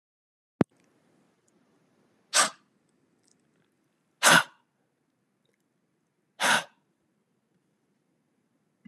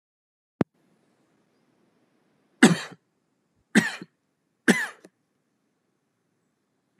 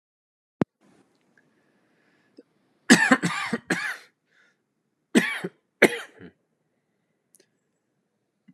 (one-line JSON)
{"exhalation_length": "8.9 s", "exhalation_amplitude": 19569, "exhalation_signal_mean_std_ratio": 0.19, "three_cough_length": "7.0 s", "three_cough_amplitude": 28643, "three_cough_signal_mean_std_ratio": 0.19, "cough_length": "8.5 s", "cough_amplitude": 30347, "cough_signal_mean_std_ratio": 0.24, "survey_phase": "alpha (2021-03-01 to 2021-08-12)", "age": "18-44", "gender": "Male", "wearing_mask": "No", "symptom_fatigue": true, "symptom_fever_high_temperature": true, "symptom_change_to_sense_of_smell_or_taste": true, "smoker_status": "Never smoked", "respiratory_condition_asthma": true, "respiratory_condition_other": false, "recruitment_source": "Test and Trace", "submission_delay": "2 days", "covid_test_result": "Positive", "covid_test_method": "RT-qPCR", "covid_ct_value": 28.2, "covid_ct_gene": "N gene"}